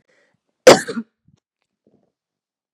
{"cough_length": "2.7 s", "cough_amplitude": 32768, "cough_signal_mean_std_ratio": 0.18, "survey_phase": "beta (2021-08-13 to 2022-03-07)", "age": "45-64", "gender": "Female", "wearing_mask": "No", "symptom_none": true, "smoker_status": "Ex-smoker", "respiratory_condition_asthma": false, "respiratory_condition_other": false, "recruitment_source": "REACT", "submission_delay": "3 days", "covid_test_result": "Negative", "covid_test_method": "RT-qPCR", "influenza_a_test_result": "Negative", "influenza_b_test_result": "Negative"}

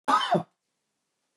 {"cough_length": "1.4 s", "cough_amplitude": 11560, "cough_signal_mean_std_ratio": 0.39, "survey_phase": "beta (2021-08-13 to 2022-03-07)", "age": "65+", "gender": "Male", "wearing_mask": "No", "symptom_none": true, "smoker_status": "Ex-smoker", "respiratory_condition_asthma": false, "respiratory_condition_other": false, "recruitment_source": "REACT", "submission_delay": "1 day", "covid_test_result": "Negative", "covid_test_method": "RT-qPCR", "influenza_a_test_result": "Negative", "influenza_b_test_result": "Negative"}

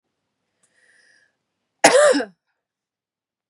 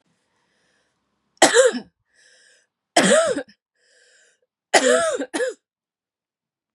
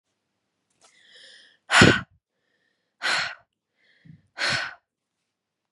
{"cough_length": "3.5 s", "cough_amplitude": 32767, "cough_signal_mean_std_ratio": 0.27, "three_cough_length": "6.7 s", "three_cough_amplitude": 32768, "three_cough_signal_mean_std_ratio": 0.36, "exhalation_length": "5.7 s", "exhalation_amplitude": 27089, "exhalation_signal_mean_std_ratio": 0.26, "survey_phase": "beta (2021-08-13 to 2022-03-07)", "age": "18-44", "gender": "Female", "wearing_mask": "No", "symptom_runny_or_blocked_nose": true, "symptom_fatigue": true, "symptom_change_to_sense_of_smell_or_taste": true, "symptom_onset": "12 days", "smoker_status": "Never smoked", "respiratory_condition_asthma": false, "respiratory_condition_other": false, "recruitment_source": "REACT", "submission_delay": "2 days", "covid_test_result": "Negative", "covid_test_method": "RT-qPCR", "influenza_a_test_result": "Negative", "influenza_b_test_result": "Negative"}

